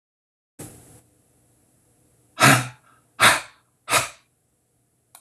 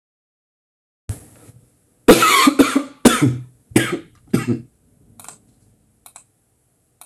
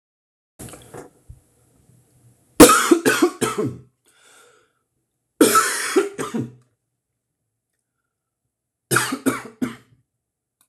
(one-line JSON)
{"exhalation_length": "5.2 s", "exhalation_amplitude": 26186, "exhalation_signal_mean_std_ratio": 0.27, "cough_length": "7.1 s", "cough_amplitude": 28373, "cough_signal_mean_std_ratio": 0.34, "three_cough_length": "10.7 s", "three_cough_amplitude": 31506, "three_cough_signal_mean_std_ratio": 0.31, "survey_phase": "alpha (2021-03-01 to 2021-08-12)", "age": "18-44", "gender": "Male", "wearing_mask": "No", "symptom_none": true, "smoker_status": "Ex-smoker", "respiratory_condition_asthma": false, "respiratory_condition_other": false, "recruitment_source": "REACT", "submission_delay": "1 day", "covid_test_result": "Negative", "covid_test_method": "RT-qPCR"}